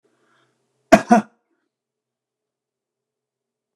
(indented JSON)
{
  "cough_length": "3.8 s",
  "cough_amplitude": 29204,
  "cough_signal_mean_std_ratio": 0.17,
  "survey_phase": "beta (2021-08-13 to 2022-03-07)",
  "age": "45-64",
  "gender": "Male",
  "wearing_mask": "No",
  "symptom_none": true,
  "smoker_status": "Never smoked",
  "respiratory_condition_asthma": false,
  "respiratory_condition_other": false,
  "recruitment_source": "REACT",
  "submission_delay": "2 days",
  "covid_test_result": "Negative",
  "covid_test_method": "RT-qPCR"
}